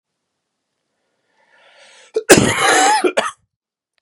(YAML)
cough_length: 4.0 s
cough_amplitude: 32768
cough_signal_mean_std_ratio: 0.38
survey_phase: beta (2021-08-13 to 2022-03-07)
age: 18-44
gender: Male
wearing_mask: 'No'
symptom_cough_any: true
symptom_runny_or_blocked_nose: true
symptom_fatigue: true
symptom_change_to_sense_of_smell_or_taste: true
symptom_loss_of_taste: true
symptom_onset: 3 days
smoker_status: Never smoked
respiratory_condition_asthma: true
respiratory_condition_other: false
recruitment_source: Test and Trace
submission_delay: 2 days
covid_test_result: Positive
covid_test_method: RT-qPCR
covid_ct_value: 17.3
covid_ct_gene: N gene
covid_ct_mean: 17.4
covid_viral_load: 1900000 copies/ml
covid_viral_load_category: High viral load (>1M copies/ml)